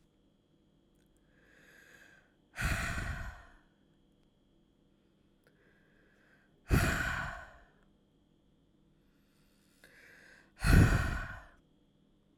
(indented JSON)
{
  "exhalation_length": "12.4 s",
  "exhalation_amplitude": 9513,
  "exhalation_signal_mean_std_ratio": 0.29,
  "survey_phase": "alpha (2021-03-01 to 2021-08-12)",
  "age": "18-44",
  "gender": "Female",
  "wearing_mask": "No",
  "symptom_none": true,
  "smoker_status": "Ex-smoker",
  "respiratory_condition_asthma": false,
  "respiratory_condition_other": false,
  "recruitment_source": "Test and Trace",
  "submission_delay": "0 days",
  "covid_test_result": "Negative",
  "covid_test_method": "LFT"
}